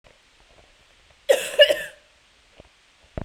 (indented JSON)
{
  "cough_length": "3.2 s",
  "cough_amplitude": 28223,
  "cough_signal_mean_std_ratio": 0.26,
  "survey_phase": "beta (2021-08-13 to 2022-03-07)",
  "age": "18-44",
  "gender": "Female",
  "wearing_mask": "No",
  "symptom_cough_any": true,
  "symptom_runny_or_blocked_nose": true,
  "symptom_shortness_of_breath": true,
  "symptom_change_to_sense_of_smell_or_taste": true,
  "symptom_loss_of_taste": true,
  "symptom_other": true,
  "symptom_onset": "8 days",
  "smoker_status": "Prefer not to say",
  "respiratory_condition_asthma": false,
  "respiratory_condition_other": false,
  "recruitment_source": "REACT",
  "submission_delay": "1 day",
  "covid_test_result": "Positive",
  "covid_test_method": "RT-qPCR",
  "covid_ct_value": 31.0,
  "covid_ct_gene": "N gene"
}